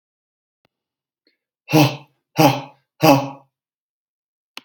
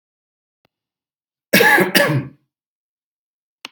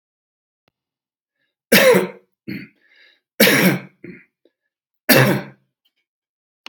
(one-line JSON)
{"exhalation_length": "4.6 s", "exhalation_amplitude": 32768, "exhalation_signal_mean_std_ratio": 0.29, "cough_length": "3.7 s", "cough_amplitude": 32768, "cough_signal_mean_std_ratio": 0.34, "three_cough_length": "6.7 s", "three_cough_amplitude": 32768, "three_cough_signal_mean_std_ratio": 0.33, "survey_phase": "beta (2021-08-13 to 2022-03-07)", "age": "45-64", "gender": "Male", "wearing_mask": "No", "symptom_cough_any": true, "symptom_sore_throat": true, "smoker_status": "Ex-smoker", "respiratory_condition_asthma": false, "respiratory_condition_other": false, "recruitment_source": "REACT", "submission_delay": "2 days", "covid_test_result": "Positive", "covid_test_method": "RT-qPCR", "covid_ct_value": 33.1, "covid_ct_gene": "N gene", "influenza_a_test_result": "Negative", "influenza_b_test_result": "Negative"}